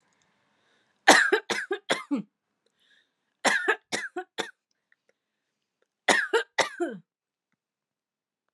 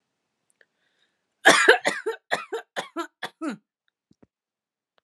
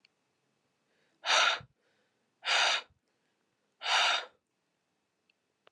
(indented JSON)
{
  "three_cough_length": "8.5 s",
  "three_cough_amplitude": 31002,
  "three_cough_signal_mean_std_ratio": 0.31,
  "cough_length": "5.0 s",
  "cough_amplitude": 32316,
  "cough_signal_mean_std_ratio": 0.28,
  "exhalation_length": "5.7 s",
  "exhalation_amplitude": 7454,
  "exhalation_signal_mean_std_ratio": 0.35,
  "survey_phase": "alpha (2021-03-01 to 2021-08-12)",
  "age": "18-44",
  "gender": "Female",
  "wearing_mask": "No",
  "symptom_none": true,
  "smoker_status": "Never smoked",
  "respiratory_condition_asthma": false,
  "respiratory_condition_other": false,
  "recruitment_source": "Test and Trace",
  "submission_delay": "1 day",
  "covid_test_result": "Negative",
  "covid_test_method": "LFT"
}